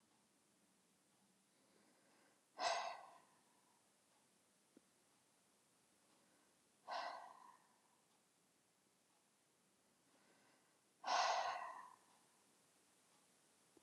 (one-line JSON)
{"exhalation_length": "13.8 s", "exhalation_amplitude": 1458, "exhalation_signal_mean_std_ratio": 0.29, "survey_phase": "alpha (2021-03-01 to 2021-08-12)", "age": "18-44", "gender": "Female", "wearing_mask": "No", "symptom_none": true, "smoker_status": "Never smoked", "respiratory_condition_asthma": false, "respiratory_condition_other": false, "recruitment_source": "REACT", "submission_delay": "6 days", "covid_test_result": "Negative", "covid_test_method": "RT-qPCR"}